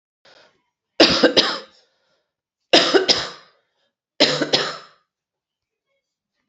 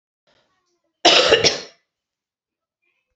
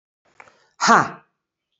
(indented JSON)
{
  "three_cough_length": "6.5 s",
  "three_cough_amplitude": 32767,
  "three_cough_signal_mean_std_ratio": 0.35,
  "cough_length": "3.2 s",
  "cough_amplitude": 32092,
  "cough_signal_mean_std_ratio": 0.31,
  "exhalation_length": "1.8 s",
  "exhalation_amplitude": 32585,
  "exhalation_signal_mean_std_ratio": 0.28,
  "survey_phase": "beta (2021-08-13 to 2022-03-07)",
  "age": "45-64",
  "gender": "Female",
  "wearing_mask": "No",
  "symptom_cough_any": true,
  "symptom_runny_or_blocked_nose": true,
  "symptom_headache": true,
  "symptom_loss_of_taste": true,
  "symptom_onset": "6 days",
  "smoker_status": "Ex-smoker",
  "respiratory_condition_asthma": false,
  "respiratory_condition_other": false,
  "recruitment_source": "Test and Trace",
  "submission_delay": "3 days",
  "covid_test_result": "Positive",
  "covid_test_method": "RT-qPCR"
}